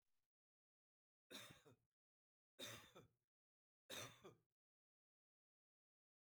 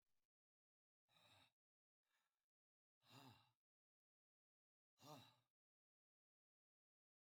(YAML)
three_cough_length: 6.2 s
three_cough_amplitude: 356
three_cough_signal_mean_std_ratio: 0.31
exhalation_length: 7.3 s
exhalation_amplitude: 156
exhalation_signal_mean_std_ratio: 0.27
survey_phase: beta (2021-08-13 to 2022-03-07)
age: 65+
gender: Male
wearing_mask: 'No'
symptom_none: true
smoker_status: Ex-smoker
respiratory_condition_asthma: false
respiratory_condition_other: false
recruitment_source: REACT
submission_delay: 1 day
covid_test_result: Negative
covid_test_method: RT-qPCR
influenza_a_test_result: Negative
influenza_b_test_result: Negative